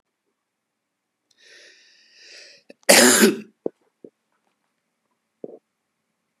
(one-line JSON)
{"cough_length": "6.4 s", "cough_amplitude": 32767, "cough_signal_mean_std_ratio": 0.22, "survey_phase": "beta (2021-08-13 to 2022-03-07)", "age": "45-64", "gender": "Male", "wearing_mask": "No", "symptom_cough_any": true, "symptom_sore_throat": true, "symptom_fatigue": true, "symptom_onset": "3 days", "smoker_status": "Never smoked", "respiratory_condition_asthma": false, "respiratory_condition_other": false, "recruitment_source": "Test and Trace", "submission_delay": "2 days", "covid_test_result": "Positive", "covid_test_method": "RT-qPCR", "covid_ct_value": 16.9, "covid_ct_gene": "ORF1ab gene", "covid_ct_mean": 17.2, "covid_viral_load": "2300000 copies/ml", "covid_viral_load_category": "High viral load (>1M copies/ml)"}